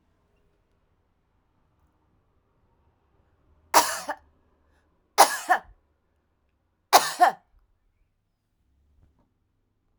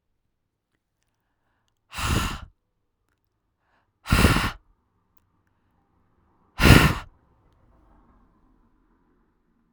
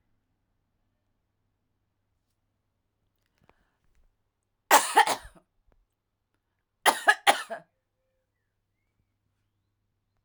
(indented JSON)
{
  "three_cough_length": "10.0 s",
  "three_cough_amplitude": 30493,
  "three_cough_signal_mean_std_ratio": 0.2,
  "exhalation_length": "9.7 s",
  "exhalation_amplitude": 32768,
  "exhalation_signal_mean_std_ratio": 0.24,
  "cough_length": "10.2 s",
  "cough_amplitude": 21760,
  "cough_signal_mean_std_ratio": 0.18,
  "survey_phase": "alpha (2021-03-01 to 2021-08-12)",
  "age": "45-64",
  "gender": "Female",
  "wearing_mask": "No",
  "symptom_none": true,
  "smoker_status": "Never smoked",
  "respiratory_condition_asthma": false,
  "respiratory_condition_other": false,
  "recruitment_source": "REACT",
  "submission_delay": "2 days",
  "covid_test_result": "Negative",
  "covid_test_method": "RT-qPCR"
}